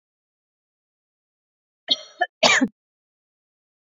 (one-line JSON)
{"cough_length": "3.9 s", "cough_amplitude": 26308, "cough_signal_mean_std_ratio": 0.23, "survey_phase": "beta (2021-08-13 to 2022-03-07)", "age": "45-64", "gender": "Female", "wearing_mask": "No", "symptom_none": true, "smoker_status": "Never smoked", "respiratory_condition_asthma": false, "respiratory_condition_other": false, "recruitment_source": "REACT", "submission_delay": "1 day", "covid_test_result": "Negative", "covid_test_method": "RT-qPCR", "influenza_a_test_result": "Negative", "influenza_b_test_result": "Negative"}